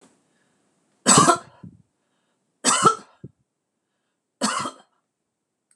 {"three_cough_length": "5.8 s", "three_cough_amplitude": 26027, "three_cough_signal_mean_std_ratio": 0.29, "survey_phase": "beta (2021-08-13 to 2022-03-07)", "age": "65+", "gender": "Female", "wearing_mask": "No", "symptom_none": true, "smoker_status": "Never smoked", "respiratory_condition_asthma": false, "respiratory_condition_other": false, "recruitment_source": "REACT", "submission_delay": "2 days", "covid_test_result": "Negative", "covid_test_method": "RT-qPCR", "influenza_a_test_result": "Negative", "influenza_b_test_result": "Negative"}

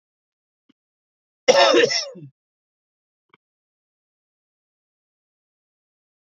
{"cough_length": "6.2 s", "cough_amplitude": 28317, "cough_signal_mean_std_ratio": 0.23, "survey_phase": "beta (2021-08-13 to 2022-03-07)", "age": "45-64", "gender": "Male", "wearing_mask": "No", "symptom_cough_any": true, "symptom_new_continuous_cough": true, "symptom_runny_or_blocked_nose": true, "symptom_headache": true, "symptom_onset": "3 days", "smoker_status": "Never smoked", "respiratory_condition_asthma": true, "respiratory_condition_other": false, "recruitment_source": "Test and Trace", "submission_delay": "1 day", "covid_test_result": "Positive", "covid_test_method": "RT-qPCR", "covid_ct_value": 25.0, "covid_ct_gene": "ORF1ab gene", "covid_ct_mean": 25.3, "covid_viral_load": "5100 copies/ml", "covid_viral_load_category": "Minimal viral load (< 10K copies/ml)"}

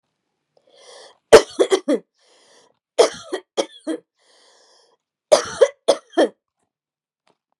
{"three_cough_length": "7.6 s", "three_cough_amplitude": 32768, "three_cough_signal_mean_std_ratio": 0.26, "survey_phase": "beta (2021-08-13 to 2022-03-07)", "age": "45-64", "gender": "Female", "wearing_mask": "No", "symptom_runny_or_blocked_nose": true, "symptom_onset": "12 days", "smoker_status": "Never smoked", "respiratory_condition_asthma": false, "respiratory_condition_other": false, "recruitment_source": "REACT", "submission_delay": "1 day", "covid_test_result": "Negative", "covid_test_method": "RT-qPCR", "influenza_a_test_result": "Negative", "influenza_b_test_result": "Negative"}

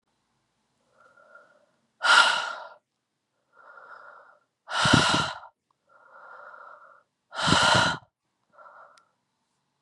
{"exhalation_length": "9.8 s", "exhalation_amplitude": 26321, "exhalation_signal_mean_std_ratio": 0.34, "survey_phase": "beta (2021-08-13 to 2022-03-07)", "age": "18-44", "gender": "Female", "wearing_mask": "No", "symptom_cough_any": true, "symptom_new_continuous_cough": true, "symptom_runny_or_blocked_nose": true, "symptom_sore_throat": true, "symptom_abdominal_pain": true, "symptom_fever_high_temperature": true, "symptom_headache": true, "symptom_change_to_sense_of_smell_or_taste": true, "symptom_loss_of_taste": true, "symptom_onset": "4 days", "smoker_status": "Never smoked", "respiratory_condition_asthma": false, "respiratory_condition_other": false, "recruitment_source": "Test and Trace", "submission_delay": "2 days", "covid_test_result": "Positive", "covid_test_method": "RT-qPCR", "covid_ct_value": 15.1, "covid_ct_gene": "ORF1ab gene", "covid_ct_mean": 15.4, "covid_viral_load": "9200000 copies/ml", "covid_viral_load_category": "High viral load (>1M copies/ml)"}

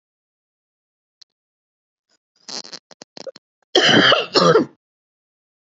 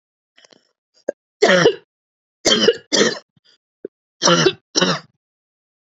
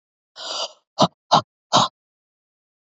{"cough_length": "5.7 s", "cough_amplitude": 30221, "cough_signal_mean_std_ratio": 0.31, "three_cough_length": "5.9 s", "three_cough_amplitude": 29492, "three_cough_signal_mean_std_ratio": 0.38, "exhalation_length": "2.8 s", "exhalation_amplitude": 27129, "exhalation_signal_mean_std_ratio": 0.3, "survey_phase": "beta (2021-08-13 to 2022-03-07)", "age": "18-44", "gender": "Female", "wearing_mask": "No", "symptom_none": true, "smoker_status": "Never smoked", "respiratory_condition_asthma": false, "respiratory_condition_other": false, "recruitment_source": "Test and Trace", "submission_delay": "1 day", "covid_test_result": "Negative", "covid_test_method": "RT-qPCR"}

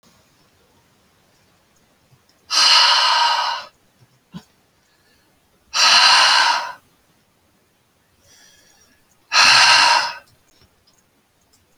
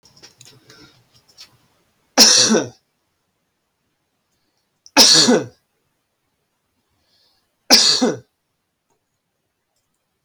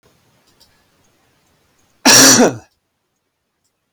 {"exhalation_length": "11.8 s", "exhalation_amplitude": 32768, "exhalation_signal_mean_std_ratio": 0.41, "three_cough_length": "10.2 s", "three_cough_amplitude": 32768, "three_cough_signal_mean_std_ratio": 0.29, "cough_length": "3.9 s", "cough_amplitude": 32768, "cough_signal_mean_std_ratio": 0.3, "survey_phase": "beta (2021-08-13 to 2022-03-07)", "age": "65+", "gender": "Male", "wearing_mask": "No", "symptom_none": true, "smoker_status": "Never smoked", "respiratory_condition_asthma": false, "respiratory_condition_other": false, "recruitment_source": "REACT", "submission_delay": "2 days", "covid_test_result": "Negative", "covid_test_method": "RT-qPCR"}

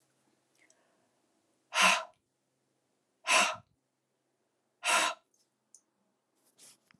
{"exhalation_length": "7.0 s", "exhalation_amplitude": 8925, "exhalation_signal_mean_std_ratio": 0.27, "survey_phase": "beta (2021-08-13 to 2022-03-07)", "age": "45-64", "gender": "Female", "wearing_mask": "No", "symptom_none": true, "smoker_status": "Ex-smoker", "respiratory_condition_asthma": false, "respiratory_condition_other": false, "recruitment_source": "REACT", "submission_delay": "1 day", "covid_test_method": "RT-qPCR"}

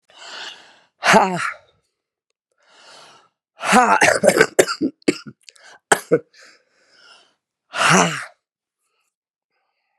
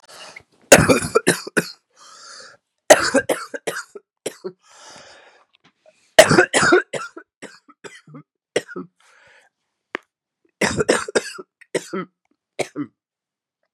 {"exhalation_length": "10.0 s", "exhalation_amplitude": 32768, "exhalation_signal_mean_std_ratio": 0.35, "three_cough_length": "13.7 s", "three_cough_amplitude": 32768, "three_cough_signal_mean_std_ratio": 0.3, "survey_phase": "beta (2021-08-13 to 2022-03-07)", "age": "45-64", "gender": "Female", "wearing_mask": "No", "symptom_cough_any": true, "symptom_new_continuous_cough": true, "symptom_runny_or_blocked_nose": true, "symptom_sore_throat": true, "symptom_fatigue": true, "symptom_headache": true, "symptom_change_to_sense_of_smell_or_taste": true, "symptom_other": true, "symptom_onset": "3 days", "smoker_status": "Never smoked", "respiratory_condition_asthma": false, "respiratory_condition_other": false, "recruitment_source": "Test and Trace", "submission_delay": "2 days", "covid_test_result": "Positive", "covid_test_method": "RT-qPCR", "covid_ct_value": 13.4, "covid_ct_gene": "ORF1ab gene", "covid_ct_mean": 14.1, "covid_viral_load": "23000000 copies/ml", "covid_viral_load_category": "High viral load (>1M copies/ml)"}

